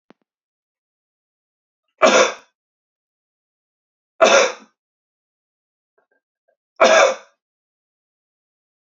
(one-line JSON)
{"three_cough_length": "9.0 s", "three_cough_amplitude": 29979, "three_cough_signal_mean_std_ratio": 0.25, "survey_phase": "beta (2021-08-13 to 2022-03-07)", "age": "18-44", "gender": "Male", "wearing_mask": "No", "symptom_none": true, "smoker_status": "Never smoked", "respiratory_condition_asthma": false, "respiratory_condition_other": false, "recruitment_source": "Test and Trace", "submission_delay": "2 days", "covid_test_result": "Positive", "covid_test_method": "ePCR"}